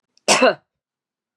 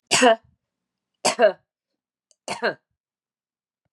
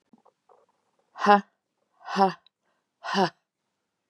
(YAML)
cough_length: 1.4 s
cough_amplitude: 30860
cough_signal_mean_std_ratio: 0.34
three_cough_length: 3.9 s
three_cough_amplitude: 23185
three_cough_signal_mean_std_ratio: 0.3
exhalation_length: 4.1 s
exhalation_amplitude: 23955
exhalation_signal_mean_std_ratio: 0.26
survey_phase: beta (2021-08-13 to 2022-03-07)
age: 45-64
gender: Female
wearing_mask: 'No'
symptom_cough_any: true
symptom_sore_throat: true
symptom_onset: 2 days
smoker_status: Never smoked
respiratory_condition_asthma: true
respiratory_condition_other: false
recruitment_source: Test and Trace
submission_delay: 1 day
covid_test_result: Positive
covid_test_method: RT-qPCR
covid_ct_value: 27.0
covid_ct_gene: N gene